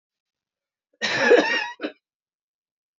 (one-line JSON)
{"cough_length": "3.0 s", "cough_amplitude": 22054, "cough_signal_mean_std_ratio": 0.35, "survey_phase": "beta (2021-08-13 to 2022-03-07)", "age": "18-44", "gender": "Female", "wearing_mask": "No", "symptom_cough_any": true, "symptom_runny_or_blocked_nose": true, "symptom_sore_throat": true, "symptom_fatigue": true, "symptom_headache": true, "symptom_onset": "3 days", "smoker_status": "Ex-smoker", "respiratory_condition_asthma": false, "respiratory_condition_other": false, "recruitment_source": "Test and Trace", "submission_delay": "1 day", "covid_test_result": "Positive", "covid_test_method": "RT-qPCR", "covid_ct_value": 15.3, "covid_ct_gene": "ORF1ab gene", "covid_ct_mean": 15.6, "covid_viral_load": "7800000 copies/ml", "covid_viral_load_category": "High viral load (>1M copies/ml)"}